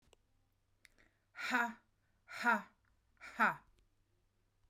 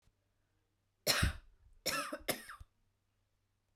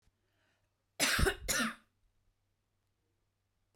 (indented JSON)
{
  "exhalation_length": "4.7 s",
  "exhalation_amplitude": 3789,
  "exhalation_signal_mean_std_ratio": 0.31,
  "three_cough_length": "3.8 s",
  "three_cough_amplitude": 5368,
  "three_cough_signal_mean_std_ratio": 0.34,
  "cough_length": "3.8 s",
  "cough_amplitude": 4938,
  "cough_signal_mean_std_ratio": 0.33,
  "survey_phase": "beta (2021-08-13 to 2022-03-07)",
  "age": "18-44",
  "gender": "Female",
  "wearing_mask": "No",
  "symptom_none": true,
  "smoker_status": "Ex-smoker",
  "respiratory_condition_asthma": false,
  "respiratory_condition_other": false,
  "recruitment_source": "REACT",
  "submission_delay": "2 days",
  "covid_test_result": "Negative",
  "covid_test_method": "RT-qPCR"
}